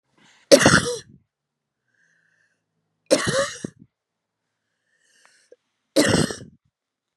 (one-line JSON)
{"three_cough_length": "7.2 s", "three_cough_amplitude": 32768, "three_cough_signal_mean_std_ratio": 0.28, "survey_phase": "beta (2021-08-13 to 2022-03-07)", "age": "45-64", "gender": "Male", "wearing_mask": "No", "symptom_cough_any": true, "symptom_runny_or_blocked_nose": true, "symptom_sore_throat": true, "symptom_fatigue": true, "symptom_headache": true, "smoker_status": "Never smoked", "respiratory_condition_asthma": false, "respiratory_condition_other": false, "recruitment_source": "Test and Trace", "submission_delay": "0 days", "covid_test_result": "Negative", "covid_test_method": "RT-qPCR"}